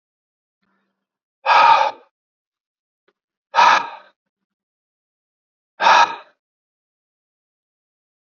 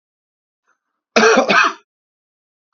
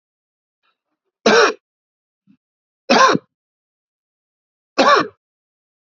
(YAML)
exhalation_length: 8.4 s
exhalation_amplitude: 32767
exhalation_signal_mean_std_ratio: 0.28
cough_length: 2.7 s
cough_amplitude: 31076
cough_signal_mean_std_ratio: 0.36
three_cough_length: 5.9 s
three_cough_amplitude: 30335
three_cough_signal_mean_std_ratio: 0.3
survey_phase: alpha (2021-03-01 to 2021-08-12)
age: 18-44
gender: Male
wearing_mask: 'No'
symptom_cough_any: true
symptom_fatigue: true
symptom_change_to_sense_of_smell_or_taste: true
symptom_loss_of_taste: true
smoker_status: Never smoked
respiratory_condition_asthma: false
respiratory_condition_other: false
recruitment_source: Test and Trace
submission_delay: 2 days
covid_test_result: Positive
covid_test_method: RT-qPCR
covid_ct_value: 20.2
covid_ct_gene: ORF1ab gene